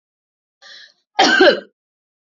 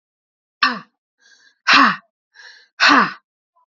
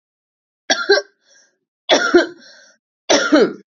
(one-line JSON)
{"cough_length": "2.2 s", "cough_amplitude": 28462, "cough_signal_mean_std_ratio": 0.35, "exhalation_length": "3.7 s", "exhalation_amplitude": 30602, "exhalation_signal_mean_std_ratio": 0.35, "three_cough_length": "3.7 s", "three_cough_amplitude": 29783, "three_cough_signal_mean_std_ratio": 0.42, "survey_phase": "beta (2021-08-13 to 2022-03-07)", "age": "18-44", "gender": "Female", "wearing_mask": "No", "symptom_cough_any": true, "symptom_diarrhoea": true, "symptom_change_to_sense_of_smell_or_taste": true, "symptom_loss_of_taste": true, "smoker_status": "Never smoked", "respiratory_condition_asthma": false, "respiratory_condition_other": false, "recruitment_source": "Test and Trace", "submission_delay": "2 days", "covid_test_result": "Positive", "covid_test_method": "RT-qPCR"}